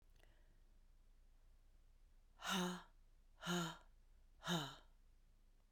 {"exhalation_length": "5.7 s", "exhalation_amplitude": 1156, "exhalation_signal_mean_std_ratio": 0.43, "survey_phase": "beta (2021-08-13 to 2022-03-07)", "age": "45-64", "gender": "Female", "wearing_mask": "No", "symptom_cough_any": true, "symptom_runny_or_blocked_nose": true, "symptom_shortness_of_breath": true, "symptom_sore_throat": true, "symptom_fatigue": true, "symptom_change_to_sense_of_smell_or_taste": true, "symptom_loss_of_taste": true, "symptom_onset": "3 days", "smoker_status": "Never smoked", "respiratory_condition_asthma": false, "respiratory_condition_other": false, "recruitment_source": "Test and Trace", "submission_delay": "2 days", "covid_test_result": "Positive", "covid_test_method": "ePCR"}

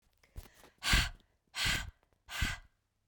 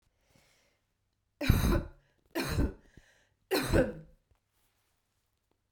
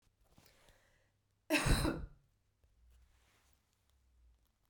{"exhalation_length": "3.1 s", "exhalation_amplitude": 6551, "exhalation_signal_mean_std_ratio": 0.41, "three_cough_length": "5.7 s", "three_cough_amplitude": 12710, "three_cough_signal_mean_std_ratio": 0.35, "cough_length": "4.7 s", "cough_amplitude": 4252, "cough_signal_mean_std_ratio": 0.27, "survey_phase": "beta (2021-08-13 to 2022-03-07)", "age": "18-44", "gender": "Female", "wearing_mask": "No", "symptom_cough_any": true, "symptom_runny_or_blocked_nose": true, "symptom_fatigue": true, "smoker_status": "Never smoked", "respiratory_condition_asthma": false, "respiratory_condition_other": false, "recruitment_source": "Test and Trace", "submission_delay": "2 days", "covid_test_result": "Positive", "covid_test_method": "RT-qPCR", "covid_ct_value": 12.2, "covid_ct_gene": "ORF1ab gene", "covid_ct_mean": 12.3, "covid_viral_load": "96000000 copies/ml", "covid_viral_load_category": "High viral load (>1M copies/ml)"}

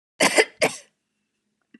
{"cough_length": "1.8 s", "cough_amplitude": 27336, "cough_signal_mean_std_ratio": 0.32, "survey_phase": "beta (2021-08-13 to 2022-03-07)", "age": "45-64", "gender": "Female", "wearing_mask": "No", "symptom_none": true, "smoker_status": "Never smoked", "respiratory_condition_asthma": false, "respiratory_condition_other": false, "recruitment_source": "REACT", "submission_delay": "2 days", "covid_test_result": "Negative", "covid_test_method": "RT-qPCR", "influenza_a_test_result": "Negative", "influenza_b_test_result": "Negative"}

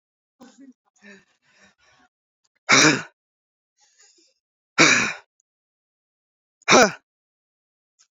{"exhalation_length": "8.1 s", "exhalation_amplitude": 27825, "exhalation_signal_mean_std_ratio": 0.25, "survey_phase": "beta (2021-08-13 to 2022-03-07)", "age": "18-44", "gender": "Male", "wearing_mask": "No", "symptom_none": true, "smoker_status": "Never smoked", "respiratory_condition_asthma": false, "respiratory_condition_other": false, "recruitment_source": "REACT", "submission_delay": "1 day", "covid_test_result": "Negative", "covid_test_method": "RT-qPCR"}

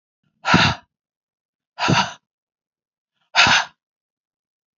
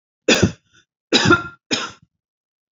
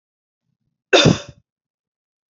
{"exhalation_length": "4.8 s", "exhalation_amplitude": 29329, "exhalation_signal_mean_std_ratio": 0.33, "three_cough_length": "2.7 s", "three_cough_amplitude": 28386, "three_cough_signal_mean_std_ratio": 0.38, "cough_length": "2.3 s", "cough_amplitude": 28373, "cough_signal_mean_std_ratio": 0.25, "survey_phase": "beta (2021-08-13 to 2022-03-07)", "age": "45-64", "gender": "Female", "wearing_mask": "No", "symptom_runny_or_blocked_nose": true, "symptom_sore_throat": true, "symptom_headache": true, "smoker_status": "Never smoked", "respiratory_condition_asthma": false, "respiratory_condition_other": false, "recruitment_source": "Test and Trace", "submission_delay": "2 days", "covid_test_result": "Positive", "covid_test_method": "RT-qPCR", "covid_ct_value": 18.0, "covid_ct_gene": "ORF1ab gene", "covid_ct_mean": 18.3, "covid_viral_load": "980000 copies/ml", "covid_viral_load_category": "Low viral load (10K-1M copies/ml)"}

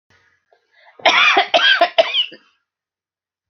{"cough_length": "3.5 s", "cough_amplitude": 31816, "cough_signal_mean_std_ratio": 0.44, "survey_phase": "alpha (2021-03-01 to 2021-08-12)", "age": "45-64", "gender": "Female", "wearing_mask": "No", "symptom_headache": true, "smoker_status": "Never smoked", "respiratory_condition_asthma": false, "respiratory_condition_other": false, "recruitment_source": "REACT", "submission_delay": "1 day", "covid_test_result": "Negative", "covid_test_method": "RT-qPCR"}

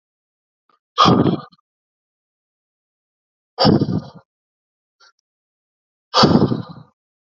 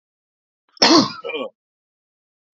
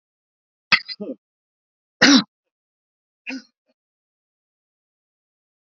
{"exhalation_length": "7.3 s", "exhalation_amplitude": 32767, "exhalation_signal_mean_std_ratio": 0.32, "cough_length": "2.6 s", "cough_amplitude": 32768, "cough_signal_mean_std_ratio": 0.3, "three_cough_length": "5.7 s", "three_cough_amplitude": 29585, "three_cough_signal_mean_std_ratio": 0.19, "survey_phase": "alpha (2021-03-01 to 2021-08-12)", "age": "45-64", "gender": "Male", "wearing_mask": "No", "symptom_none": true, "smoker_status": "Ex-smoker", "respiratory_condition_asthma": false, "respiratory_condition_other": false, "recruitment_source": "REACT", "submission_delay": "2 days", "covid_test_result": "Negative", "covid_test_method": "RT-qPCR"}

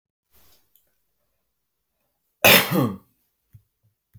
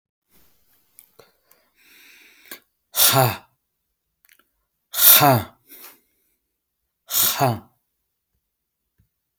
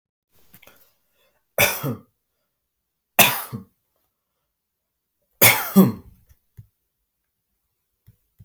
{"cough_length": "4.2 s", "cough_amplitude": 32767, "cough_signal_mean_std_ratio": 0.24, "exhalation_length": "9.4 s", "exhalation_amplitude": 32768, "exhalation_signal_mean_std_ratio": 0.28, "three_cough_length": "8.4 s", "three_cough_amplitude": 32768, "three_cough_signal_mean_std_ratio": 0.24, "survey_phase": "beta (2021-08-13 to 2022-03-07)", "age": "18-44", "gender": "Male", "wearing_mask": "Prefer not to say", "symptom_prefer_not_to_say": true, "smoker_status": "Prefer not to say", "recruitment_source": "REACT", "submission_delay": "4 days", "covid_test_result": "Negative", "covid_test_method": "RT-qPCR", "influenza_a_test_result": "Negative", "influenza_b_test_result": "Negative"}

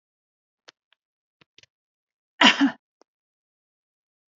{"three_cough_length": "4.4 s", "three_cough_amplitude": 27520, "three_cough_signal_mean_std_ratio": 0.18, "survey_phase": "beta (2021-08-13 to 2022-03-07)", "age": "45-64", "gender": "Female", "wearing_mask": "No", "symptom_none": true, "smoker_status": "Ex-smoker", "respiratory_condition_asthma": false, "respiratory_condition_other": false, "recruitment_source": "REACT", "submission_delay": "1 day", "covid_test_result": "Negative", "covid_test_method": "RT-qPCR", "influenza_a_test_result": "Negative", "influenza_b_test_result": "Negative"}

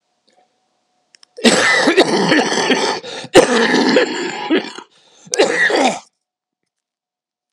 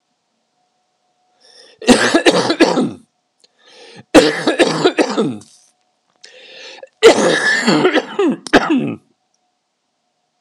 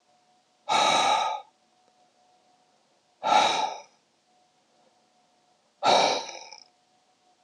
{"cough_length": "7.5 s", "cough_amplitude": 32768, "cough_signal_mean_std_ratio": 0.56, "three_cough_length": "10.4 s", "three_cough_amplitude": 32768, "three_cough_signal_mean_std_ratio": 0.46, "exhalation_length": "7.4 s", "exhalation_amplitude": 14245, "exhalation_signal_mean_std_ratio": 0.39, "survey_phase": "alpha (2021-03-01 to 2021-08-12)", "age": "45-64", "gender": "Male", "wearing_mask": "No", "symptom_cough_any": true, "symptom_shortness_of_breath": true, "symptom_abdominal_pain": true, "symptom_fatigue": true, "smoker_status": "Never smoked", "respiratory_condition_asthma": true, "respiratory_condition_other": false, "recruitment_source": "Test and Trace", "submission_delay": "0 days", "covid_test_result": "Positive", "covid_test_method": "LFT"}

